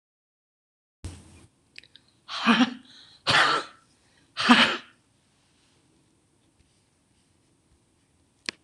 {"exhalation_length": "8.6 s", "exhalation_amplitude": 26027, "exhalation_signal_mean_std_ratio": 0.28, "survey_phase": "beta (2021-08-13 to 2022-03-07)", "age": "65+", "gender": "Female", "wearing_mask": "Yes", "symptom_cough_any": true, "symptom_new_continuous_cough": true, "symptom_shortness_of_breath": true, "symptom_onset": "12 days", "smoker_status": "Ex-smoker", "respiratory_condition_asthma": false, "respiratory_condition_other": true, "recruitment_source": "REACT", "submission_delay": "1 day", "covid_test_result": "Negative", "covid_test_method": "RT-qPCR", "influenza_a_test_result": "Negative", "influenza_b_test_result": "Negative"}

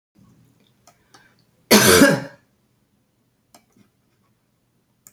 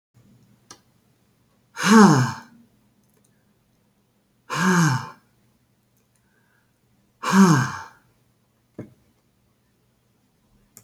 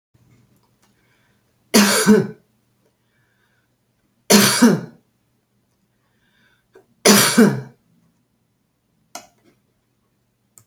{"cough_length": "5.1 s", "cough_amplitude": 32767, "cough_signal_mean_std_ratio": 0.25, "exhalation_length": "10.8 s", "exhalation_amplitude": 26505, "exhalation_signal_mean_std_ratio": 0.29, "three_cough_length": "10.7 s", "three_cough_amplitude": 32768, "three_cough_signal_mean_std_ratio": 0.3, "survey_phase": "alpha (2021-03-01 to 2021-08-12)", "age": "65+", "gender": "Female", "wearing_mask": "No", "symptom_none": true, "smoker_status": "Never smoked", "respiratory_condition_asthma": false, "respiratory_condition_other": false, "recruitment_source": "REACT", "submission_delay": "2 days", "covid_test_result": "Negative", "covid_test_method": "RT-qPCR"}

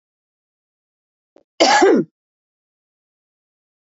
{"cough_length": "3.8 s", "cough_amplitude": 31049, "cough_signal_mean_std_ratio": 0.28, "survey_phase": "beta (2021-08-13 to 2022-03-07)", "age": "45-64", "gender": "Female", "wearing_mask": "No", "symptom_none": true, "symptom_onset": "8 days", "smoker_status": "Never smoked", "respiratory_condition_asthma": false, "respiratory_condition_other": false, "recruitment_source": "REACT", "submission_delay": "1 day", "covid_test_result": "Negative", "covid_test_method": "RT-qPCR", "influenza_a_test_result": "Unknown/Void", "influenza_b_test_result": "Unknown/Void"}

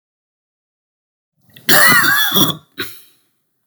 {"cough_length": "3.7 s", "cough_amplitude": 32768, "cough_signal_mean_std_ratio": 0.41, "survey_phase": "beta (2021-08-13 to 2022-03-07)", "age": "65+", "gender": "Male", "wearing_mask": "No", "symptom_cough_any": true, "symptom_sore_throat": true, "symptom_fatigue": true, "smoker_status": "Ex-smoker", "respiratory_condition_asthma": false, "respiratory_condition_other": false, "recruitment_source": "Test and Trace", "submission_delay": "1 day", "covid_test_result": "Positive", "covid_test_method": "RT-qPCR", "covid_ct_value": 24.3, "covid_ct_gene": "ORF1ab gene", "covid_ct_mean": 25.1, "covid_viral_load": "5900 copies/ml", "covid_viral_load_category": "Minimal viral load (< 10K copies/ml)"}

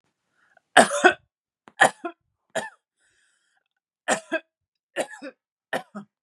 {"three_cough_length": "6.2 s", "three_cough_amplitude": 32767, "three_cough_signal_mean_std_ratio": 0.24, "survey_phase": "beta (2021-08-13 to 2022-03-07)", "age": "18-44", "gender": "Female", "wearing_mask": "No", "symptom_none": true, "smoker_status": "Never smoked", "respiratory_condition_asthma": false, "respiratory_condition_other": false, "recruitment_source": "REACT", "submission_delay": "1 day", "covid_test_result": "Negative", "covid_test_method": "RT-qPCR", "influenza_a_test_result": "Negative", "influenza_b_test_result": "Negative"}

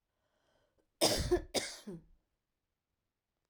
{"cough_length": "3.5 s", "cough_amplitude": 5549, "cough_signal_mean_std_ratio": 0.32, "survey_phase": "alpha (2021-03-01 to 2021-08-12)", "age": "45-64", "gender": "Female", "wearing_mask": "No", "symptom_cough_any": true, "smoker_status": "Never smoked", "respiratory_condition_asthma": false, "respiratory_condition_other": false, "recruitment_source": "REACT", "submission_delay": "2 days", "covid_test_result": "Negative", "covid_test_method": "RT-qPCR"}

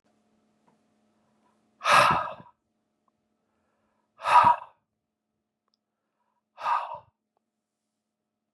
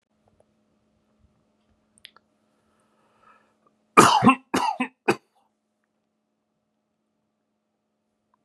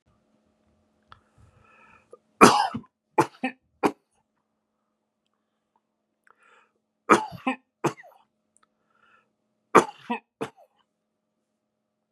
{"exhalation_length": "8.5 s", "exhalation_amplitude": 17237, "exhalation_signal_mean_std_ratio": 0.26, "cough_length": "8.4 s", "cough_amplitude": 32768, "cough_signal_mean_std_ratio": 0.2, "three_cough_length": "12.1 s", "three_cough_amplitude": 32768, "three_cough_signal_mean_std_ratio": 0.19, "survey_phase": "beta (2021-08-13 to 2022-03-07)", "age": "45-64", "gender": "Male", "wearing_mask": "No", "symptom_new_continuous_cough": true, "symptom_fatigue": true, "symptom_fever_high_temperature": true, "symptom_headache": true, "symptom_change_to_sense_of_smell_or_taste": true, "symptom_loss_of_taste": true, "smoker_status": "Never smoked", "respiratory_condition_asthma": false, "respiratory_condition_other": false, "recruitment_source": "Test and Trace", "submission_delay": "2 days", "covid_test_result": "Positive", "covid_test_method": "RT-qPCR", "covid_ct_value": 25.8, "covid_ct_gene": "N gene"}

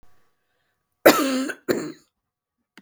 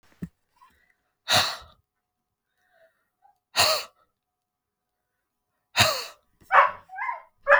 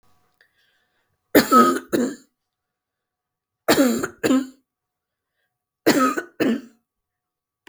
{"cough_length": "2.8 s", "cough_amplitude": 32768, "cough_signal_mean_std_ratio": 0.31, "exhalation_length": "7.6 s", "exhalation_amplitude": 24151, "exhalation_signal_mean_std_ratio": 0.3, "three_cough_length": "7.7 s", "three_cough_amplitude": 32768, "three_cough_signal_mean_std_ratio": 0.36, "survey_phase": "beta (2021-08-13 to 2022-03-07)", "age": "45-64", "gender": "Female", "wearing_mask": "No", "symptom_runny_or_blocked_nose": true, "symptom_onset": "5 days", "smoker_status": "Ex-smoker", "respiratory_condition_asthma": false, "respiratory_condition_other": true, "recruitment_source": "REACT", "submission_delay": "2 days", "covid_test_result": "Negative", "covid_test_method": "RT-qPCR"}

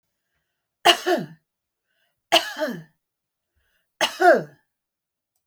{"three_cough_length": "5.5 s", "three_cough_amplitude": 29555, "three_cough_signal_mean_std_ratio": 0.3, "survey_phase": "beta (2021-08-13 to 2022-03-07)", "age": "65+", "gender": "Female", "wearing_mask": "No", "symptom_none": true, "smoker_status": "Never smoked", "respiratory_condition_asthma": false, "respiratory_condition_other": false, "recruitment_source": "REACT", "submission_delay": "1 day", "covid_test_result": "Negative", "covid_test_method": "RT-qPCR"}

